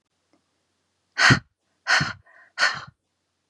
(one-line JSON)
{"exhalation_length": "3.5 s", "exhalation_amplitude": 24356, "exhalation_signal_mean_std_ratio": 0.31, "survey_phase": "beta (2021-08-13 to 2022-03-07)", "age": "18-44", "gender": "Female", "wearing_mask": "No", "symptom_fatigue": true, "symptom_onset": "12 days", "smoker_status": "Never smoked", "respiratory_condition_asthma": false, "respiratory_condition_other": false, "recruitment_source": "REACT", "submission_delay": "3 days", "covid_test_result": "Negative", "covid_test_method": "RT-qPCR", "influenza_a_test_result": "Negative", "influenza_b_test_result": "Negative"}